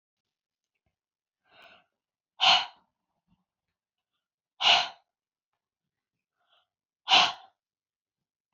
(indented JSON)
{
  "exhalation_length": "8.5 s",
  "exhalation_amplitude": 14920,
  "exhalation_signal_mean_std_ratio": 0.22,
  "survey_phase": "beta (2021-08-13 to 2022-03-07)",
  "age": "45-64",
  "gender": "Female",
  "wearing_mask": "No",
  "symptom_none": true,
  "smoker_status": "Never smoked",
  "respiratory_condition_asthma": false,
  "respiratory_condition_other": false,
  "recruitment_source": "REACT",
  "submission_delay": "1 day",
  "covid_test_result": "Negative",
  "covid_test_method": "RT-qPCR",
  "influenza_a_test_result": "Negative",
  "influenza_b_test_result": "Negative"
}